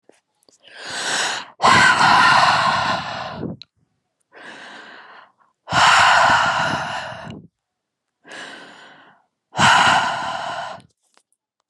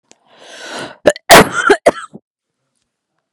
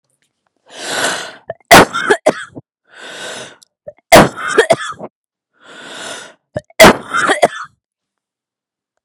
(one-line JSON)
{"exhalation_length": "11.7 s", "exhalation_amplitude": 29200, "exhalation_signal_mean_std_ratio": 0.52, "cough_length": "3.3 s", "cough_amplitude": 32768, "cough_signal_mean_std_ratio": 0.33, "three_cough_length": "9.0 s", "three_cough_amplitude": 32768, "three_cough_signal_mean_std_ratio": 0.35, "survey_phase": "beta (2021-08-13 to 2022-03-07)", "age": "45-64", "gender": "Female", "wearing_mask": "No", "symptom_none": true, "smoker_status": "Never smoked", "respiratory_condition_asthma": false, "respiratory_condition_other": false, "recruitment_source": "REACT", "submission_delay": "1 day", "covid_test_result": "Negative", "covid_test_method": "RT-qPCR"}